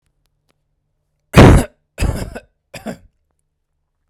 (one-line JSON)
{"cough_length": "4.1 s", "cough_amplitude": 32768, "cough_signal_mean_std_ratio": 0.27, "survey_phase": "beta (2021-08-13 to 2022-03-07)", "age": "45-64", "gender": "Male", "wearing_mask": "No", "symptom_sore_throat": true, "smoker_status": "Ex-smoker", "respiratory_condition_asthma": false, "respiratory_condition_other": false, "recruitment_source": "Test and Trace", "submission_delay": "1 day", "covid_test_result": "Positive", "covid_test_method": "RT-qPCR", "covid_ct_value": 33.1, "covid_ct_gene": "N gene", "covid_ct_mean": 34.2, "covid_viral_load": "6 copies/ml", "covid_viral_load_category": "Minimal viral load (< 10K copies/ml)"}